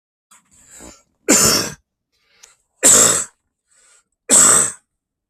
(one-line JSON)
{"three_cough_length": "5.3 s", "three_cough_amplitude": 32768, "three_cough_signal_mean_std_ratio": 0.39, "survey_phase": "beta (2021-08-13 to 2022-03-07)", "age": "65+", "gender": "Male", "wearing_mask": "No", "symptom_runny_or_blocked_nose": true, "symptom_onset": "12 days", "smoker_status": "Ex-smoker", "respiratory_condition_asthma": false, "respiratory_condition_other": true, "recruitment_source": "REACT", "submission_delay": "1 day", "covid_test_result": "Negative", "covid_test_method": "RT-qPCR", "influenza_a_test_result": "Negative", "influenza_b_test_result": "Negative"}